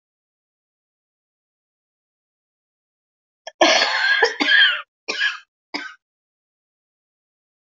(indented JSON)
{
  "cough_length": "7.8 s",
  "cough_amplitude": 25577,
  "cough_signal_mean_std_ratio": 0.33,
  "survey_phase": "beta (2021-08-13 to 2022-03-07)",
  "age": "45-64",
  "gender": "Female",
  "wearing_mask": "No",
  "symptom_new_continuous_cough": true,
  "symptom_runny_or_blocked_nose": true,
  "symptom_shortness_of_breath": true,
  "symptom_sore_throat": true,
  "symptom_abdominal_pain": true,
  "symptom_fatigue": true,
  "symptom_headache": true,
  "symptom_onset": "3 days",
  "smoker_status": "Ex-smoker",
  "respiratory_condition_asthma": true,
  "respiratory_condition_other": false,
  "recruitment_source": "Test and Trace",
  "submission_delay": "2 days",
  "covid_test_result": "Positive",
  "covid_test_method": "RT-qPCR"
}